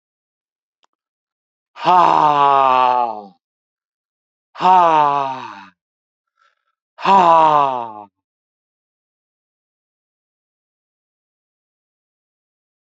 exhalation_length: 12.9 s
exhalation_amplitude: 31506
exhalation_signal_mean_std_ratio: 0.36
survey_phase: beta (2021-08-13 to 2022-03-07)
age: 65+
gender: Male
wearing_mask: 'No'
symptom_none: true
smoker_status: Ex-smoker
respiratory_condition_asthma: false
respiratory_condition_other: false
recruitment_source: REACT
submission_delay: 2 days
covid_test_result: Negative
covid_test_method: RT-qPCR
influenza_a_test_result: Negative
influenza_b_test_result: Negative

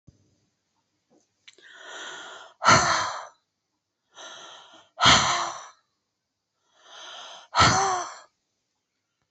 exhalation_length: 9.3 s
exhalation_amplitude: 21262
exhalation_signal_mean_std_ratio: 0.34
survey_phase: beta (2021-08-13 to 2022-03-07)
age: 45-64
gender: Female
wearing_mask: 'No'
symptom_none: true
smoker_status: Never smoked
respiratory_condition_asthma: false
respiratory_condition_other: false
recruitment_source: REACT
submission_delay: 3 days
covid_test_result: Negative
covid_test_method: RT-qPCR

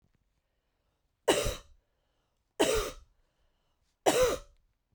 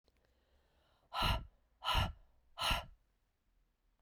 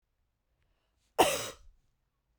three_cough_length: 4.9 s
three_cough_amplitude: 10701
three_cough_signal_mean_std_ratio: 0.34
exhalation_length: 4.0 s
exhalation_amplitude: 3278
exhalation_signal_mean_std_ratio: 0.38
cough_length: 2.4 s
cough_amplitude: 11084
cough_signal_mean_std_ratio: 0.24
survey_phase: beta (2021-08-13 to 2022-03-07)
age: 18-44
gender: Female
wearing_mask: 'No'
symptom_cough_any: true
symptom_runny_or_blocked_nose: true
symptom_shortness_of_breath: true
symptom_fatigue: true
symptom_change_to_sense_of_smell_or_taste: true
symptom_other: true
symptom_onset: 3 days
smoker_status: Never smoked
respiratory_condition_asthma: false
respiratory_condition_other: false
recruitment_source: Test and Trace
submission_delay: 1 day
covid_test_result: Positive
covid_test_method: RT-qPCR
covid_ct_value: 15.4
covid_ct_gene: ORF1ab gene
covid_ct_mean: 15.7
covid_viral_load: 7100000 copies/ml
covid_viral_load_category: High viral load (>1M copies/ml)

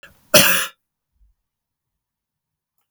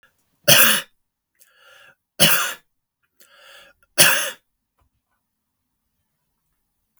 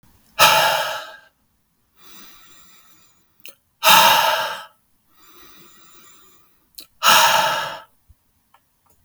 cough_length: 2.9 s
cough_amplitude: 32768
cough_signal_mean_std_ratio: 0.25
three_cough_length: 7.0 s
three_cough_amplitude: 32768
three_cough_signal_mean_std_ratio: 0.28
exhalation_length: 9.0 s
exhalation_amplitude: 32768
exhalation_signal_mean_std_ratio: 0.38
survey_phase: beta (2021-08-13 to 2022-03-07)
age: 65+
gender: Male
wearing_mask: 'No'
symptom_none: true
smoker_status: Never smoked
respiratory_condition_asthma: false
respiratory_condition_other: false
recruitment_source: REACT
submission_delay: 2 days
covid_test_result: Negative
covid_test_method: RT-qPCR
influenza_a_test_result: Negative
influenza_b_test_result: Negative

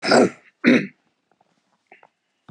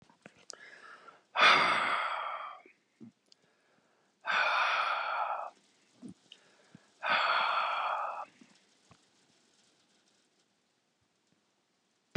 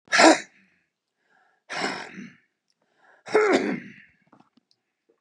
cough_length: 2.5 s
cough_amplitude: 28053
cough_signal_mean_std_ratio: 0.34
exhalation_length: 12.2 s
exhalation_amplitude: 9861
exhalation_signal_mean_std_ratio: 0.43
three_cough_length: 5.2 s
three_cough_amplitude: 31458
three_cough_signal_mean_std_ratio: 0.32
survey_phase: beta (2021-08-13 to 2022-03-07)
age: 65+
gender: Male
wearing_mask: 'No'
symptom_none: true
smoker_status: Ex-smoker
respiratory_condition_asthma: false
respiratory_condition_other: false
recruitment_source: REACT
submission_delay: 3 days
covid_test_result: Negative
covid_test_method: RT-qPCR
influenza_a_test_result: Negative
influenza_b_test_result: Negative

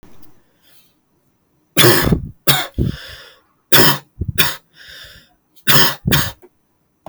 three_cough_length: 7.1 s
three_cough_amplitude: 32768
three_cough_signal_mean_std_ratio: 0.4
survey_phase: alpha (2021-03-01 to 2021-08-12)
age: 18-44
gender: Male
wearing_mask: 'No'
symptom_none: true
smoker_status: Never smoked
respiratory_condition_asthma: false
respiratory_condition_other: false
recruitment_source: REACT
submission_delay: 1 day
covid_test_result: Negative
covid_test_method: RT-qPCR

